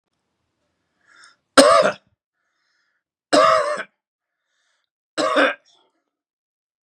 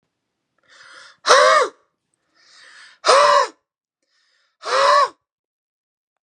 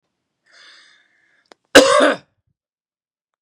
three_cough_length: 6.8 s
three_cough_amplitude: 32768
three_cough_signal_mean_std_ratio: 0.32
exhalation_length: 6.2 s
exhalation_amplitude: 32767
exhalation_signal_mean_std_ratio: 0.37
cough_length: 3.4 s
cough_amplitude: 32768
cough_signal_mean_std_ratio: 0.26
survey_phase: beta (2021-08-13 to 2022-03-07)
age: 45-64
gender: Male
wearing_mask: 'No'
symptom_cough_any: true
symptom_runny_or_blocked_nose: true
symptom_headache: true
symptom_onset: 3 days
smoker_status: Never smoked
respiratory_condition_asthma: false
respiratory_condition_other: false
recruitment_source: Test and Trace
submission_delay: 2 days
covid_test_result: Positive
covid_test_method: RT-qPCR
covid_ct_value: 20.1
covid_ct_gene: ORF1ab gene
covid_ct_mean: 20.4
covid_viral_load: 210000 copies/ml
covid_viral_load_category: Low viral load (10K-1M copies/ml)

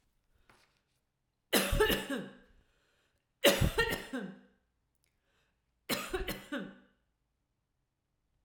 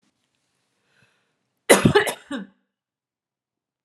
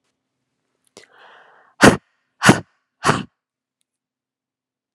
three_cough_length: 8.4 s
three_cough_amplitude: 9205
three_cough_signal_mean_std_ratio: 0.35
cough_length: 3.8 s
cough_amplitude: 32767
cough_signal_mean_std_ratio: 0.24
exhalation_length: 4.9 s
exhalation_amplitude: 32768
exhalation_signal_mean_std_ratio: 0.21
survey_phase: alpha (2021-03-01 to 2021-08-12)
age: 18-44
gender: Female
wearing_mask: 'No'
symptom_fatigue: true
symptom_headache: true
symptom_onset: 12 days
smoker_status: Never smoked
respiratory_condition_asthma: false
respiratory_condition_other: false
recruitment_source: REACT
submission_delay: 6 days
covid_test_result: Negative
covid_test_method: RT-qPCR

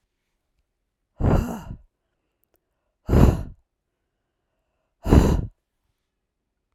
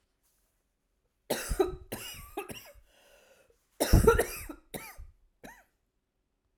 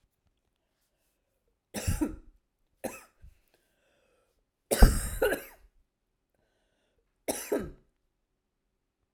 exhalation_length: 6.7 s
exhalation_amplitude: 32768
exhalation_signal_mean_std_ratio: 0.29
cough_length: 6.6 s
cough_amplitude: 15912
cough_signal_mean_std_ratio: 0.29
three_cough_length: 9.1 s
three_cough_amplitude: 23521
three_cough_signal_mean_std_ratio: 0.22
survey_phase: alpha (2021-03-01 to 2021-08-12)
age: 45-64
gender: Female
wearing_mask: 'No'
symptom_cough_any: true
symptom_abdominal_pain: true
symptom_fatigue: true
symptom_headache: true
symptom_change_to_sense_of_smell_or_taste: true
symptom_loss_of_taste: true
symptom_onset: 8 days
smoker_status: Never smoked
respiratory_condition_asthma: false
respiratory_condition_other: false
recruitment_source: Test and Trace
submission_delay: 3 days
covid_test_result: Positive
covid_test_method: RT-qPCR
covid_ct_value: 15.4
covid_ct_gene: ORF1ab gene
covid_ct_mean: 15.8
covid_viral_load: 6400000 copies/ml
covid_viral_load_category: High viral load (>1M copies/ml)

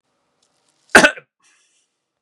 cough_length: 2.2 s
cough_amplitude: 32768
cough_signal_mean_std_ratio: 0.2
survey_phase: beta (2021-08-13 to 2022-03-07)
age: 18-44
gender: Male
wearing_mask: 'Yes'
symptom_cough_any: true
symptom_new_continuous_cough: true
symptom_sore_throat: true
symptom_fatigue: true
symptom_headache: true
symptom_onset: 6 days
smoker_status: Never smoked
respiratory_condition_asthma: false
respiratory_condition_other: false
recruitment_source: Test and Trace
submission_delay: 2 days
covid_test_result: Positive
covid_test_method: ePCR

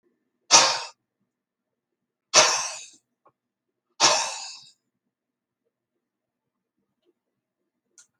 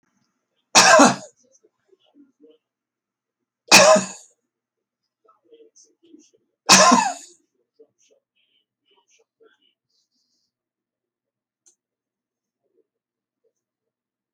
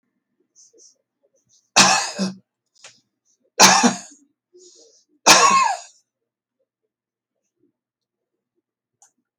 exhalation_length: 8.2 s
exhalation_amplitude: 32504
exhalation_signal_mean_std_ratio: 0.25
cough_length: 14.3 s
cough_amplitude: 32768
cough_signal_mean_std_ratio: 0.22
three_cough_length: 9.4 s
three_cough_amplitude: 32768
three_cough_signal_mean_std_ratio: 0.29
survey_phase: alpha (2021-03-01 to 2021-08-12)
age: 65+
gender: Male
wearing_mask: 'No'
symptom_none: true
smoker_status: Ex-smoker
respiratory_condition_asthma: false
respiratory_condition_other: false
recruitment_source: REACT
submission_delay: 1 day
covid_test_result: Negative
covid_test_method: RT-qPCR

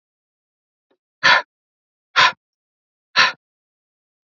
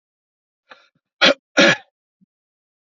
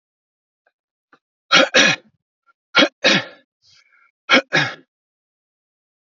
exhalation_length: 4.3 s
exhalation_amplitude: 29151
exhalation_signal_mean_std_ratio: 0.26
cough_length: 2.9 s
cough_amplitude: 32768
cough_signal_mean_std_ratio: 0.26
three_cough_length: 6.1 s
three_cough_amplitude: 31311
three_cough_signal_mean_std_ratio: 0.31
survey_phase: beta (2021-08-13 to 2022-03-07)
age: 18-44
gender: Male
wearing_mask: 'No'
symptom_none: true
symptom_onset: 12 days
smoker_status: Never smoked
respiratory_condition_asthma: false
respiratory_condition_other: false
recruitment_source: REACT
submission_delay: 2 days
covid_test_result: Negative
covid_test_method: RT-qPCR
influenza_a_test_result: Negative
influenza_b_test_result: Negative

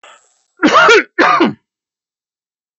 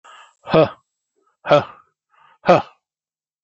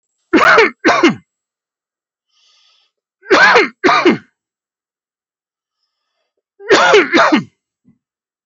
cough_length: 2.8 s
cough_amplitude: 32523
cough_signal_mean_std_ratio: 0.45
exhalation_length: 3.4 s
exhalation_amplitude: 27915
exhalation_signal_mean_std_ratio: 0.29
three_cough_length: 8.5 s
three_cough_amplitude: 30863
three_cough_signal_mean_std_ratio: 0.42
survey_phase: alpha (2021-03-01 to 2021-08-12)
age: 45-64
gender: Male
wearing_mask: 'No'
symptom_none: true
smoker_status: Ex-smoker
respiratory_condition_asthma: false
respiratory_condition_other: false
recruitment_source: REACT
submission_delay: 2 days
covid_test_result: Negative
covid_test_method: RT-qPCR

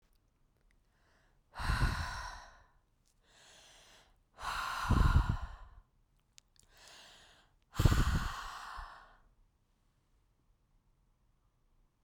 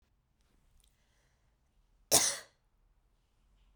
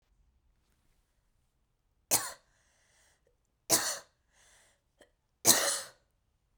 exhalation_length: 12.0 s
exhalation_amplitude: 7994
exhalation_signal_mean_std_ratio: 0.35
cough_length: 3.8 s
cough_amplitude: 13145
cough_signal_mean_std_ratio: 0.2
three_cough_length: 6.6 s
three_cough_amplitude: 16599
three_cough_signal_mean_std_ratio: 0.25
survey_phase: beta (2021-08-13 to 2022-03-07)
age: 18-44
gender: Female
wearing_mask: 'No'
symptom_fatigue: true
smoker_status: Ex-smoker
respiratory_condition_asthma: false
respiratory_condition_other: false
recruitment_source: REACT
submission_delay: 5 days
covid_test_result: Negative
covid_test_method: RT-qPCR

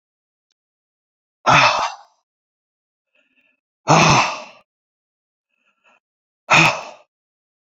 exhalation_length: 7.7 s
exhalation_amplitude: 32631
exhalation_signal_mean_std_ratio: 0.31
survey_phase: beta (2021-08-13 to 2022-03-07)
age: 45-64
gender: Male
wearing_mask: 'No'
symptom_none: true
symptom_onset: 7 days
smoker_status: Ex-smoker
respiratory_condition_asthma: true
respiratory_condition_other: false
recruitment_source: REACT
submission_delay: 1 day
covid_test_result: Negative
covid_test_method: RT-qPCR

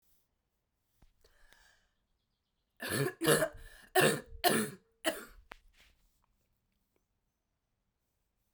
three_cough_length: 8.5 s
three_cough_amplitude: 8403
three_cough_signal_mean_std_ratio: 0.29
survey_phase: beta (2021-08-13 to 2022-03-07)
age: 45-64
gender: Female
wearing_mask: 'No'
symptom_cough_any: true
symptom_runny_or_blocked_nose: true
symptom_shortness_of_breath: true
symptom_fatigue: true
symptom_headache: true
symptom_change_to_sense_of_smell_or_taste: true
symptom_loss_of_taste: true
symptom_onset: 5 days
smoker_status: Current smoker (1 to 10 cigarettes per day)
respiratory_condition_asthma: false
respiratory_condition_other: false
recruitment_source: Test and Trace
submission_delay: 1 day
covid_test_result: Positive
covid_test_method: RT-qPCR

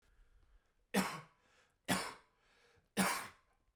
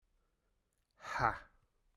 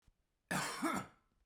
three_cough_length: 3.8 s
three_cough_amplitude: 3739
three_cough_signal_mean_std_ratio: 0.35
exhalation_length: 2.0 s
exhalation_amplitude: 5304
exhalation_signal_mean_std_ratio: 0.28
cough_length: 1.5 s
cough_amplitude: 2156
cough_signal_mean_std_ratio: 0.51
survey_phase: beta (2021-08-13 to 2022-03-07)
age: 45-64
gender: Male
wearing_mask: 'No'
symptom_cough_any: true
symptom_runny_or_blocked_nose: true
symptom_sore_throat: true
symptom_headache: true
symptom_change_to_sense_of_smell_or_taste: true
symptom_loss_of_taste: true
symptom_other: true
symptom_onset: 2 days
smoker_status: Never smoked
respiratory_condition_asthma: false
respiratory_condition_other: false
recruitment_source: Test and Trace
submission_delay: 1 day
covid_test_result: Positive
covid_test_method: RT-qPCR
covid_ct_value: 15.1
covid_ct_gene: S gene
covid_ct_mean: 15.4
covid_viral_load: 8800000 copies/ml
covid_viral_load_category: High viral load (>1M copies/ml)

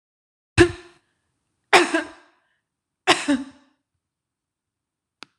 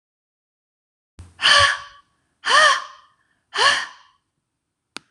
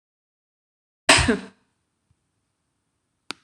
three_cough_length: 5.4 s
three_cough_amplitude: 26028
three_cough_signal_mean_std_ratio: 0.25
exhalation_length: 5.1 s
exhalation_amplitude: 26027
exhalation_signal_mean_std_ratio: 0.36
cough_length: 3.4 s
cough_amplitude: 26027
cough_signal_mean_std_ratio: 0.22
survey_phase: alpha (2021-03-01 to 2021-08-12)
age: 45-64
gender: Female
wearing_mask: 'No'
symptom_none: true
smoker_status: Ex-smoker
respiratory_condition_asthma: false
respiratory_condition_other: false
recruitment_source: REACT
submission_delay: 1 day
covid_test_result: Negative
covid_test_method: RT-qPCR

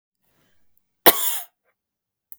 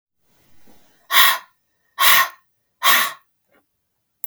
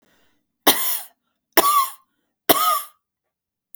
cough_length: 2.4 s
cough_amplitude: 32768
cough_signal_mean_std_ratio: 0.22
exhalation_length: 4.3 s
exhalation_amplitude: 32768
exhalation_signal_mean_std_ratio: 0.35
three_cough_length: 3.8 s
three_cough_amplitude: 32768
three_cough_signal_mean_std_ratio: 0.38
survey_phase: beta (2021-08-13 to 2022-03-07)
age: 45-64
gender: Female
wearing_mask: 'No'
symptom_none: true
smoker_status: Never smoked
respiratory_condition_asthma: false
respiratory_condition_other: true
recruitment_source: REACT
submission_delay: 3 days
covid_test_result: Negative
covid_test_method: RT-qPCR
influenza_a_test_result: Negative
influenza_b_test_result: Negative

